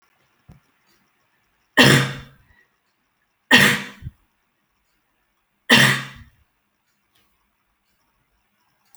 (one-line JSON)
{"three_cough_length": "9.0 s", "three_cough_amplitude": 32768, "three_cough_signal_mean_std_ratio": 0.26, "survey_phase": "alpha (2021-03-01 to 2021-08-12)", "age": "18-44", "gender": "Female", "wearing_mask": "No", "symptom_none": true, "smoker_status": "Never smoked", "respiratory_condition_asthma": false, "respiratory_condition_other": false, "recruitment_source": "REACT", "submission_delay": "4 days", "covid_test_result": "Negative", "covid_test_method": "RT-qPCR"}